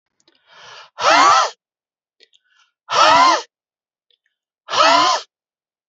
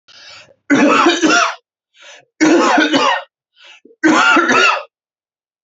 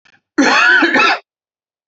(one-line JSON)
{"exhalation_length": "5.9 s", "exhalation_amplitude": 31199, "exhalation_signal_mean_std_ratio": 0.42, "three_cough_length": "5.6 s", "three_cough_amplitude": 31347, "three_cough_signal_mean_std_ratio": 0.61, "cough_length": "1.9 s", "cough_amplitude": 29967, "cough_signal_mean_std_ratio": 0.6, "survey_phase": "beta (2021-08-13 to 2022-03-07)", "age": "18-44", "gender": "Male", "wearing_mask": "No", "symptom_none": true, "smoker_status": "Never smoked", "respiratory_condition_asthma": false, "respiratory_condition_other": false, "recruitment_source": "REACT", "submission_delay": "1 day", "covid_test_result": "Negative", "covid_test_method": "RT-qPCR"}